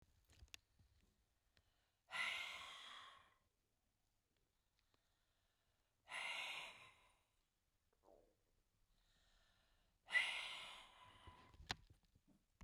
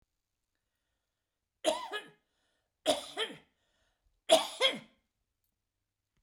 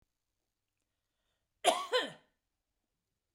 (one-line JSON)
{"exhalation_length": "12.6 s", "exhalation_amplitude": 1953, "exhalation_signal_mean_std_ratio": 0.34, "three_cough_length": "6.2 s", "three_cough_amplitude": 10182, "three_cough_signal_mean_std_ratio": 0.26, "cough_length": "3.3 s", "cough_amplitude": 7748, "cough_signal_mean_std_ratio": 0.24, "survey_phase": "beta (2021-08-13 to 2022-03-07)", "age": "65+", "gender": "Female", "wearing_mask": "No", "symptom_none": true, "smoker_status": "Ex-smoker", "respiratory_condition_asthma": false, "respiratory_condition_other": false, "recruitment_source": "REACT", "submission_delay": "1 day", "covid_test_result": "Negative", "covid_test_method": "RT-qPCR"}